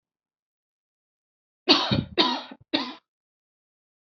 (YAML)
three_cough_length: 4.2 s
three_cough_amplitude: 27040
three_cough_signal_mean_std_ratio: 0.3
survey_phase: alpha (2021-03-01 to 2021-08-12)
age: 18-44
gender: Female
wearing_mask: 'No'
symptom_cough_any: true
symptom_new_continuous_cough: true
symptom_onset: 5 days
smoker_status: Never smoked
respiratory_condition_asthma: true
respiratory_condition_other: false
recruitment_source: Test and Trace
submission_delay: 2 days
covid_test_result: Positive
covid_test_method: RT-qPCR